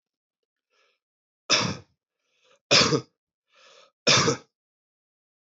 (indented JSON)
{
  "three_cough_length": "5.5 s",
  "three_cough_amplitude": 18144,
  "three_cough_signal_mean_std_ratio": 0.3,
  "survey_phase": "beta (2021-08-13 to 2022-03-07)",
  "age": "45-64",
  "gender": "Male",
  "wearing_mask": "No",
  "symptom_none": true,
  "symptom_onset": "7 days",
  "smoker_status": "Never smoked",
  "respiratory_condition_asthma": false,
  "respiratory_condition_other": false,
  "recruitment_source": "REACT",
  "submission_delay": "2 days",
  "covid_test_result": "Positive",
  "covid_test_method": "RT-qPCR",
  "covid_ct_value": 26.2,
  "covid_ct_gene": "E gene",
  "influenza_a_test_result": "Negative",
  "influenza_b_test_result": "Negative"
}